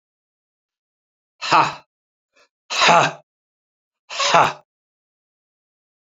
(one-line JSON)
{"exhalation_length": "6.1 s", "exhalation_amplitude": 30113, "exhalation_signal_mean_std_ratio": 0.3, "survey_phase": "beta (2021-08-13 to 2022-03-07)", "age": "65+", "gender": "Male", "wearing_mask": "No", "symptom_cough_any": true, "symptom_runny_or_blocked_nose": true, "symptom_fatigue": true, "symptom_change_to_sense_of_smell_or_taste": true, "symptom_loss_of_taste": true, "smoker_status": "Ex-smoker", "respiratory_condition_asthma": true, "respiratory_condition_other": true, "recruitment_source": "Test and Trace", "submission_delay": "1 day", "covid_test_result": "Positive", "covid_test_method": "RT-qPCR", "covid_ct_value": 19.1, "covid_ct_gene": "ORF1ab gene"}